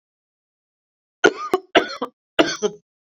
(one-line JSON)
{"three_cough_length": "3.1 s", "three_cough_amplitude": 29608, "three_cough_signal_mean_std_ratio": 0.3, "survey_phase": "beta (2021-08-13 to 2022-03-07)", "age": "45-64", "gender": "Female", "wearing_mask": "No", "symptom_none": true, "smoker_status": "Current smoker (1 to 10 cigarettes per day)", "respiratory_condition_asthma": false, "respiratory_condition_other": false, "recruitment_source": "REACT", "submission_delay": "7 days", "covid_test_result": "Negative", "covid_test_method": "RT-qPCR"}